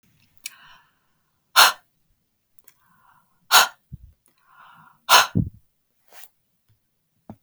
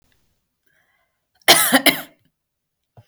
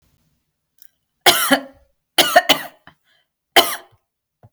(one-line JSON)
{"exhalation_length": "7.4 s", "exhalation_amplitude": 32768, "exhalation_signal_mean_std_ratio": 0.22, "cough_length": "3.1 s", "cough_amplitude": 32768, "cough_signal_mean_std_ratio": 0.27, "three_cough_length": "4.5 s", "three_cough_amplitude": 32768, "three_cough_signal_mean_std_ratio": 0.31, "survey_phase": "beta (2021-08-13 to 2022-03-07)", "age": "18-44", "gender": "Female", "wearing_mask": "No", "symptom_none": true, "smoker_status": "Never smoked", "respiratory_condition_asthma": false, "respiratory_condition_other": false, "recruitment_source": "REACT", "submission_delay": "1 day", "covid_test_result": "Negative", "covid_test_method": "RT-qPCR", "influenza_a_test_result": "Negative", "influenza_b_test_result": "Negative"}